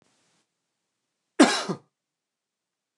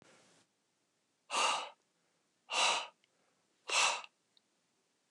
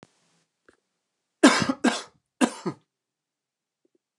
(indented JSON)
{
  "cough_length": "3.0 s",
  "cough_amplitude": 21685,
  "cough_signal_mean_std_ratio": 0.21,
  "exhalation_length": "5.1 s",
  "exhalation_amplitude": 4856,
  "exhalation_signal_mean_std_ratio": 0.36,
  "three_cough_length": "4.2 s",
  "three_cough_amplitude": 23739,
  "three_cough_signal_mean_std_ratio": 0.25,
  "survey_phase": "beta (2021-08-13 to 2022-03-07)",
  "age": "18-44",
  "gender": "Male",
  "wearing_mask": "No",
  "symptom_cough_any": true,
  "symptom_fatigue": true,
  "symptom_headache": true,
  "symptom_change_to_sense_of_smell_or_taste": true,
  "symptom_loss_of_taste": true,
  "symptom_onset": "3 days",
  "smoker_status": "Never smoked",
  "respiratory_condition_asthma": false,
  "respiratory_condition_other": false,
  "recruitment_source": "Test and Trace",
  "submission_delay": "2 days",
  "covid_test_result": "Positive",
  "covid_test_method": "RT-qPCR",
  "covid_ct_value": 15.1,
  "covid_ct_gene": "ORF1ab gene",
  "covid_ct_mean": 15.2,
  "covid_viral_load": "10000000 copies/ml",
  "covid_viral_load_category": "High viral load (>1M copies/ml)"
}